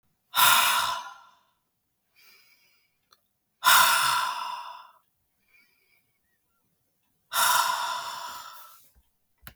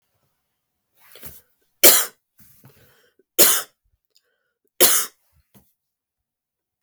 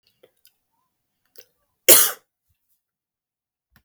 {"exhalation_length": "9.6 s", "exhalation_amplitude": 19012, "exhalation_signal_mean_std_ratio": 0.39, "three_cough_length": "6.8 s", "three_cough_amplitude": 32768, "three_cough_signal_mean_std_ratio": 0.24, "cough_length": "3.8 s", "cough_amplitude": 32768, "cough_signal_mean_std_ratio": 0.18, "survey_phase": "beta (2021-08-13 to 2022-03-07)", "age": "45-64", "gender": "Female", "wearing_mask": "No", "symptom_cough_any": true, "symptom_sore_throat": true, "symptom_fatigue": true, "symptom_onset": "12 days", "smoker_status": "Never smoked", "respiratory_condition_asthma": false, "respiratory_condition_other": true, "recruitment_source": "REACT", "submission_delay": "1 day", "covid_test_result": "Negative", "covid_test_method": "RT-qPCR", "influenza_a_test_result": "Negative", "influenza_b_test_result": "Negative"}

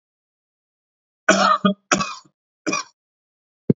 {"cough_length": "3.8 s", "cough_amplitude": 29007, "cough_signal_mean_std_ratio": 0.33, "survey_phase": "alpha (2021-03-01 to 2021-08-12)", "age": "45-64", "gender": "Male", "wearing_mask": "No", "symptom_none": true, "symptom_onset": "6 days", "smoker_status": "Never smoked", "respiratory_condition_asthma": false, "respiratory_condition_other": false, "recruitment_source": "REACT", "submission_delay": "1 day", "covid_test_result": "Negative", "covid_test_method": "RT-qPCR"}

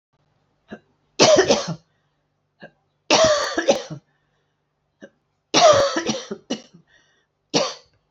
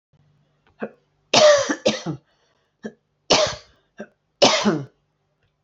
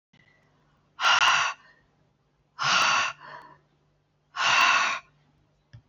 {"three_cough_length": "8.1 s", "three_cough_amplitude": 31535, "three_cough_signal_mean_std_ratio": 0.39, "cough_length": "5.6 s", "cough_amplitude": 28892, "cough_signal_mean_std_ratio": 0.36, "exhalation_length": "5.9 s", "exhalation_amplitude": 12724, "exhalation_signal_mean_std_ratio": 0.45, "survey_phase": "beta (2021-08-13 to 2022-03-07)", "age": "45-64", "gender": "Female", "wearing_mask": "No", "symptom_cough_any": true, "symptom_runny_or_blocked_nose": true, "symptom_sore_throat": true, "symptom_fatigue": true, "symptom_fever_high_temperature": true, "symptom_change_to_sense_of_smell_or_taste": true, "symptom_loss_of_taste": true, "symptom_other": true, "symptom_onset": "5 days", "smoker_status": "Never smoked", "respiratory_condition_asthma": false, "respiratory_condition_other": false, "recruitment_source": "Test and Trace", "submission_delay": "1 day", "covid_test_result": "Positive", "covid_test_method": "RT-qPCR", "covid_ct_value": 27.6, "covid_ct_gene": "ORF1ab gene", "covid_ct_mean": 28.3, "covid_viral_load": "540 copies/ml", "covid_viral_load_category": "Minimal viral load (< 10K copies/ml)"}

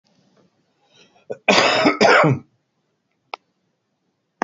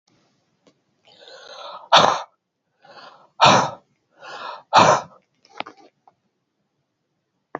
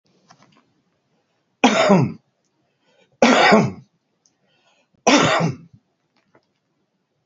{"cough_length": "4.4 s", "cough_amplitude": 32767, "cough_signal_mean_std_ratio": 0.36, "exhalation_length": "7.6 s", "exhalation_amplitude": 32768, "exhalation_signal_mean_std_ratio": 0.28, "three_cough_length": "7.3 s", "three_cough_amplitude": 29099, "three_cough_signal_mean_std_ratio": 0.36, "survey_phase": "alpha (2021-03-01 to 2021-08-12)", "age": "65+", "gender": "Male", "wearing_mask": "No", "symptom_none": true, "smoker_status": "Current smoker (1 to 10 cigarettes per day)", "respiratory_condition_asthma": false, "respiratory_condition_other": false, "recruitment_source": "REACT", "submission_delay": "1 day", "covid_test_result": "Negative", "covid_test_method": "RT-qPCR"}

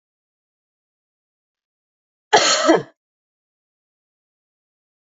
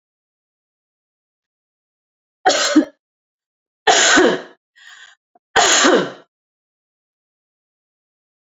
{"cough_length": "5.0 s", "cough_amplitude": 30111, "cough_signal_mean_std_ratio": 0.23, "three_cough_length": "8.4 s", "three_cough_amplitude": 31305, "three_cough_signal_mean_std_ratio": 0.33, "survey_phase": "beta (2021-08-13 to 2022-03-07)", "age": "45-64", "gender": "Female", "wearing_mask": "No", "symptom_none": true, "smoker_status": "Never smoked", "respiratory_condition_asthma": false, "respiratory_condition_other": false, "recruitment_source": "REACT", "submission_delay": "10 days", "covid_test_result": "Negative", "covid_test_method": "RT-qPCR", "influenza_a_test_result": "Negative", "influenza_b_test_result": "Negative"}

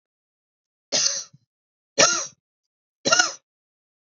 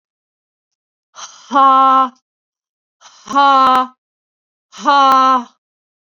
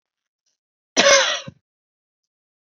{"three_cough_length": "4.0 s", "three_cough_amplitude": 26699, "three_cough_signal_mean_std_ratio": 0.32, "exhalation_length": "6.1 s", "exhalation_amplitude": 29095, "exhalation_signal_mean_std_ratio": 0.44, "cough_length": "2.6 s", "cough_amplitude": 30649, "cough_signal_mean_std_ratio": 0.3, "survey_phase": "beta (2021-08-13 to 2022-03-07)", "age": "18-44", "gender": "Female", "wearing_mask": "No", "symptom_fatigue": true, "symptom_headache": true, "smoker_status": "Never smoked", "respiratory_condition_asthma": false, "respiratory_condition_other": false, "recruitment_source": "REACT", "submission_delay": "0 days", "covid_test_result": "Negative", "covid_test_method": "RT-qPCR"}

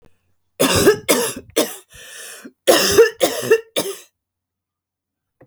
{"three_cough_length": "5.5 s", "three_cough_amplitude": 32768, "three_cough_signal_mean_std_ratio": 0.44, "survey_phase": "alpha (2021-03-01 to 2021-08-12)", "age": "45-64", "gender": "Female", "wearing_mask": "No", "symptom_cough_any": true, "symptom_abdominal_pain": true, "symptom_fatigue": true, "symptom_change_to_sense_of_smell_or_taste": true, "smoker_status": "Never smoked", "respiratory_condition_asthma": false, "respiratory_condition_other": false, "recruitment_source": "Test and Trace", "submission_delay": "2 days", "covid_test_result": "Positive", "covid_test_method": "RT-qPCR", "covid_ct_value": 16.2, "covid_ct_gene": "ORF1ab gene", "covid_ct_mean": 16.5, "covid_viral_load": "4000000 copies/ml", "covid_viral_load_category": "High viral load (>1M copies/ml)"}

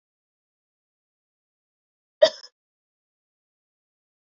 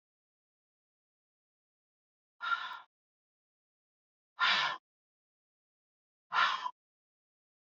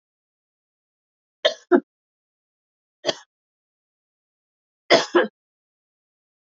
{"cough_length": "4.3 s", "cough_amplitude": 22519, "cough_signal_mean_std_ratio": 0.1, "exhalation_length": "7.8 s", "exhalation_amplitude": 5376, "exhalation_signal_mean_std_ratio": 0.27, "three_cough_length": "6.6 s", "three_cough_amplitude": 27133, "three_cough_signal_mean_std_ratio": 0.2, "survey_phase": "beta (2021-08-13 to 2022-03-07)", "age": "45-64", "gender": "Female", "wearing_mask": "No", "symptom_none": true, "smoker_status": "Never smoked", "respiratory_condition_asthma": false, "respiratory_condition_other": false, "recruitment_source": "REACT", "submission_delay": "1 day", "covid_test_result": "Negative", "covid_test_method": "RT-qPCR", "influenza_a_test_result": "Unknown/Void", "influenza_b_test_result": "Unknown/Void"}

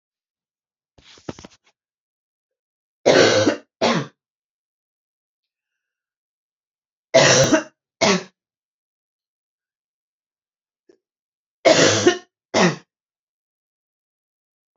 {"three_cough_length": "14.8 s", "three_cough_amplitude": 28487, "three_cough_signal_mean_std_ratio": 0.29, "survey_phase": "beta (2021-08-13 to 2022-03-07)", "age": "45-64", "gender": "Female", "wearing_mask": "No", "symptom_cough_any": true, "symptom_runny_or_blocked_nose": true, "symptom_fatigue": true, "smoker_status": "Never smoked", "respiratory_condition_asthma": false, "respiratory_condition_other": false, "recruitment_source": "Test and Trace", "submission_delay": "1 day", "covid_test_result": "Positive", "covid_test_method": "LFT"}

